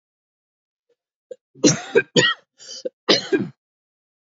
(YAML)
three_cough_length: 4.3 s
three_cough_amplitude: 28075
three_cough_signal_mean_std_ratio: 0.32
survey_phase: beta (2021-08-13 to 2022-03-07)
age: 45-64
gender: Male
wearing_mask: 'No'
symptom_cough_any: true
symptom_runny_or_blocked_nose: true
symptom_sore_throat: true
symptom_fatigue: true
symptom_headache: true
symptom_change_to_sense_of_smell_or_taste: true
symptom_onset: 2 days
smoker_status: Never smoked
respiratory_condition_asthma: false
respiratory_condition_other: false
recruitment_source: Test and Trace
submission_delay: 1 day
covid_test_result: Positive
covid_test_method: RT-qPCR
covid_ct_value: 19.8
covid_ct_gene: ORF1ab gene
covid_ct_mean: 20.2
covid_viral_load: 240000 copies/ml
covid_viral_load_category: Low viral load (10K-1M copies/ml)